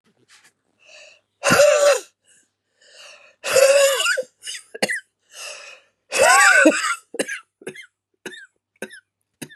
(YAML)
exhalation_length: 9.6 s
exhalation_amplitude: 29454
exhalation_signal_mean_std_ratio: 0.43
survey_phase: beta (2021-08-13 to 2022-03-07)
age: 45-64
gender: Female
wearing_mask: 'No'
symptom_cough_any: true
symptom_fatigue: true
symptom_onset: 7 days
smoker_status: Never smoked
respiratory_condition_asthma: false
respiratory_condition_other: false
recruitment_source: REACT
submission_delay: 2 days
covid_test_result: Positive
covid_test_method: RT-qPCR
covid_ct_value: 27.0
covid_ct_gene: E gene
influenza_a_test_result: Negative
influenza_b_test_result: Negative